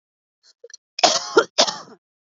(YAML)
cough_length: 2.4 s
cough_amplitude: 29943
cough_signal_mean_std_ratio: 0.32
survey_phase: beta (2021-08-13 to 2022-03-07)
age: 18-44
gender: Female
wearing_mask: 'No'
symptom_runny_or_blocked_nose: true
symptom_sore_throat: true
symptom_onset: 13 days
smoker_status: Never smoked
respiratory_condition_asthma: true
respiratory_condition_other: false
recruitment_source: REACT
submission_delay: 1 day
covid_test_result: Negative
covid_test_method: RT-qPCR
influenza_a_test_result: Negative
influenza_b_test_result: Negative